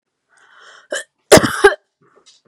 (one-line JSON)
{"cough_length": "2.5 s", "cough_amplitude": 32768, "cough_signal_mean_std_ratio": 0.28, "survey_phase": "beta (2021-08-13 to 2022-03-07)", "age": "18-44", "gender": "Female", "wearing_mask": "No", "symptom_none": true, "smoker_status": "Never smoked", "respiratory_condition_asthma": false, "respiratory_condition_other": false, "recruitment_source": "REACT", "submission_delay": "2 days", "covid_test_result": "Negative", "covid_test_method": "RT-qPCR", "influenza_a_test_result": "Negative", "influenza_b_test_result": "Negative"}